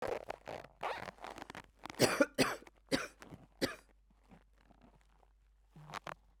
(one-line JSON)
{"three_cough_length": "6.4 s", "three_cough_amplitude": 6160, "three_cough_signal_mean_std_ratio": 0.34, "survey_phase": "beta (2021-08-13 to 2022-03-07)", "age": "45-64", "gender": "Female", "wearing_mask": "No", "symptom_cough_any": true, "symptom_runny_or_blocked_nose": true, "symptom_shortness_of_breath": true, "symptom_abdominal_pain": true, "symptom_fatigue": true, "symptom_fever_high_temperature": true, "symptom_change_to_sense_of_smell_or_taste": true, "symptom_loss_of_taste": true, "symptom_onset": "2 days", "smoker_status": "Ex-smoker", "respiratory_condition_asthma": false, "respiratory_condition_other": false, "recruitment_source": "Test and Trace", "submission_delay": "2 days", "covid_test_method": "RT-qPCR", "covid_ct_value": 20.6, "covid_ct_gene": "ORF1ab gene"}